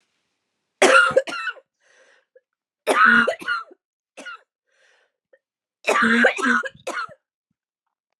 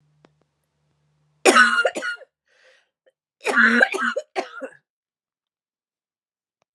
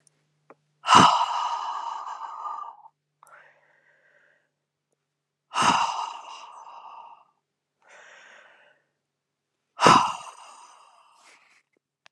three_cough_length: 8.2 s
three_cough_amplitude: 26956
three_cough_signal_mean_std_ratio: 0.39
cough_length: 6.7 s
cough_amplitude: 32228
cough_signal_mean_std_ratio: 0.33
exhalation_length: 12.1 s
exhalation_amplitude: 28325
exhalation_signal_mean_std_ratio: 0.3
survey_phase: beta (2021-08-13 to 2022-03-07)
age: 45-64
gender: Female
wearing_mask: 'No'
symptom_cough_any: true
symptom_runny_or_blocked_nose: true
symptom_fatigue: true
symptom_headache: true
symptom_other: true
symptom_onset: 6 days
smoker_status: Ex-smoker
respiratory_condition_asthma: true
respiratory_condition_other: false
recruitment_source: Test and Trace
submission_delay: 1 day
covid_test_result: Positive
covid_test_method: RT-qPCR
covid_ct_value: 19.7
covid_ct_gene: ORF1ab gene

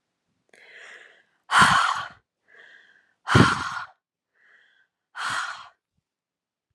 exhalation_length: 6.7 s
exhalation_amplitude: 26722
exhalation_signal_mean_std_ratio: 0.32
survey_phase: alpha (2021-03-01 to 2021-08-12)
age: 18-44
gender: Female
wearing_mask: 'No'
symptom_headache: true
smoker_status: Ex-smoker
respiratory_condition_asthma: false
respiratory_condition_other: false
recruitment_source: REACT
submission_delay: 2 days
covid_test_result: Negative
covid_test_method: RT-qPCR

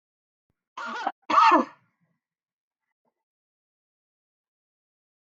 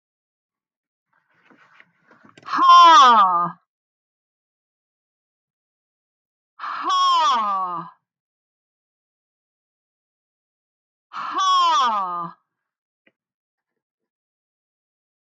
cough_length: 5.2 s
cough_amplitude: 13787
cough_signal_mean_std_ratio: 0.24
exhalation_length: 15.3 s
exhalation_amplitude: 18440
exhalation_signal_mean_std_ratio: 0.36
survey_phase: beta (2021-08-13 to 2022-03-07)
age: 45-64
gender: Female
wearing_mask: 'No'
symptom_runny_or_blocked_nose: true
symptom_fatigue: true
symptom_headache: true
symptom_onset: 12 days
smoker_status: Never smoked
respiratory_condition_asthma: false
respiratory_condition_other: false
recruitment_source: REACT
submission_delay: 1 day
covid_test_result: Negative
covid_test_method: RT-qPCR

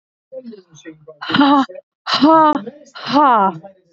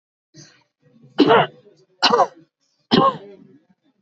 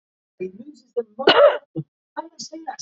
exhalation_length: 3.9 s
exhalation_amplitude: 30325
exhalation_signal_mean_std_ratio: 0.53
three_cough_length: 4.0 s
three_cough_amplitude: 30365
three_cough_signal_mean_std_ratio: 0.35
cough_length: 2.8 s
cough_amplitude: 28683
cough_signal_mean_std_ratio: 0.35
survey_phase: alpha (2021-03-01 to 2021-08-12)
age: 18-44
gender: Female
wearing_mask: 'No'
symptom_new_continuous_cough: true
symptom_shortness_of_breath: true
symptom_abdominal_pain: true
symptom_fatigue: true
symptom_headache: true
symptom_change_to_sense_of_smell_or_taste: true
symptom_loss_of_taste: true
symptom_onset: 2 days
smoker_status: Ex-smoker
respiratory_condition_asthma: true
respiratory_condition_other: false
recruitment_source: Test and Trace
submission_delay: 2 days
covid_test_result: Positive
covid_test_method: RT-qPCR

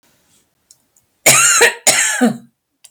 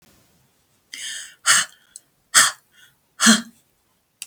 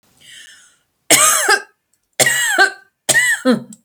cough_length: 2.9 s
cough_amplitude: 32768
cough_signal_mean_std_ratio: 0.48
exhalation_length: 4.3 s
exhalation_amplitude: 32768
exhalation_signal_mean_std_ratio: 0.3
three_cough_length: 3.8 s
three_cough_amplitude: 32768
three_cough_signal_mean_std_ratio: 0.53
survey_phase: beta (2021-08-13 to 2022-03-07)
age: 65+
gender: Female
wearing_mask: 'No'
symptom_none: true
smoker_status: Ex-smoker
respiratory_condition_asthma: false
respiratory_condition_other: false
recruitment_source: REACT
submission_delay: 3 days
covid_test_result: Negative
covid_test_method: RT-qPCR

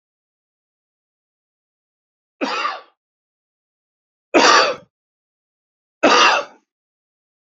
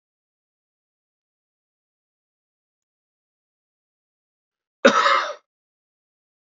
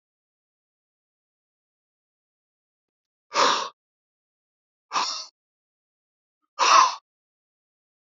three_cough_length: 7.6 s
three_cough_amplitude: 32326
three_cough_signal_mean_std_ratio: 0.29
cough_length: 6.6 s
cough_amplitude: 27847
cough_signal_mean_std_ratio: 0.19
exhalation_length: 8.0 s
exhalation_amplitude: 21381
exhalation_signal_mean_std_ratio: 0.24
survey_phase: beta (2021-08-13 to 2022-03-07)
age: 65+
gender: Male
wearing_mask: 'No'
symptom_cough_any: true
symptom_runny_or_blocked_nose: true
smoker_status: Ex-smoker
respiratory_condition_asthma: false
respiratory_condition_other: false
recruitment_source: REACT
submission_delay: 1 day
covid_test_result: Negative
covid_test_method: RT-qPCR
influenza_a_test_result: Negative
influenza_b_test_result: Negative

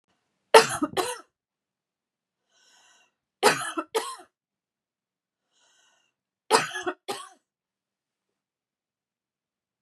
three_cough_length: 9.8 s
three_cough_amplitude: 32723
three_cough_signal_mean_std_ratio: 0.22
survey_phase: beta (2021-08-13 to 2022-03-07)
age: 45-64
gender: Female
wearing_mask: 'No'
symptom_none: true
smoker_status: Never smoked
respiratory_condition_asthma: false
respiratory_condition_other: false
recruitment_source: REACT
submission_delay: 2 days
covid_test_result: Negative
covid_test_method: RT-qPCR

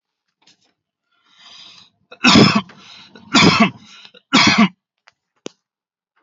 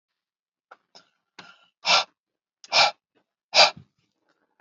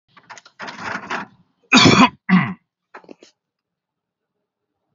three_cough_length: 6.2 s
three_cough_amplitude: 31710
three_cough_signal_mean_std_ratio: 0.35
exhalation_length: 4.6 s
exhalation_amplitude: 29371
exhalation_signal_mean_std_ratio: 0.26
cough_length: 4.9 s
cough_amplitude: 30928
cough_signal_mean_std_ratio: 0.31
survey_phase: alpha (2021-03-01 to 2021-08-12)
age: 45-64
gender: Male
wearing_mask: 'No'
symptom_none: true
smoker_status: Never smoked
respiratory_condition_asthma: false
respiratory_condition_other: false
recruitment_source: REACT
submission_delay: 2 days
covid_test_result: Negative
covid_test_method: RT-qPCR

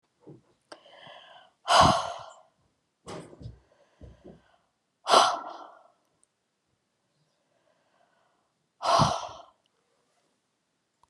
exhalation_length: 11.1 s
exhalation_amplitude: 18377
exhalation_signal_mean_std_ratio: 0.26
survey_phase: alpha (2021-03-01 to 2021-08-12)
age: 45-64
gender: Female
wearing_mask: 'No'
symptom_fatigue: true
symptom_onset: 11 days
smoker_status: Never smoked
respiratory_condition_asthma: false
respiratory_condition_other: false
recruitment_source: REACT
submission_delay: 2 days
covid_test_result: Negative
covid_test_method: RT-qPCR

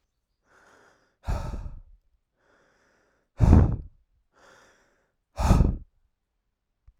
exhalation_length: 7.0 s
exhalation_amplitude: 24906
exhalation_signal_mean_std_ratio: 0.28
survey_phase: alpha (2021-03-01 to 2021-08-12)
age: 45-64
gender: Male
wearing_mask: 'No'
symptom_fatigue: true
symptom_fever_high_temperature: true
symptom_headache: true
symptom_onset: 3 days
smoker_status: Never smoked
respiratory_condition_asthma: false
respiratory_condition_other: false
recruitment_source: Test and Trace
submission_delay: 0 days
covid_test_result: Positive
covid_test_method: RT-qPCR
covid_ct_value: 29.7
covid_ct_gene: ORF1ab gene
covid_ct_mean: 30.3
covid_viral_load: 110 copies/ml
covid_viral_load_category: Minimal viral load (< 10K copies/ml)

